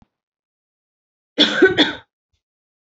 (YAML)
cough_length: 2.8 s
cough_amplitude: 29109
cough_signal_mean_std_ratio: 0.31
survey_phase: beta (2021-08-13 to 2022-03-07)
age: 18-44
gender: Female
wearing_mask: 'No'
symptom_cough_any: true
symptom_new_continuous_cough: true
symptom_runny_or_blocked_nose: true
symptom_sore_throat: true
symptom_fatigue: true
symptom_fever_high_temperature: true
symptom_onset: 3 days
smoker_status: Ex-smoker
respiratory_condition_asthma: false
respiratory_condition_other: false
recruitment_source: Test and Trace
submission_delay: 2 days
covid_test_result: Positive
covid_test_method: RT-qPCR
covid_ct_value: 23.5
covid_ct_gene: N gene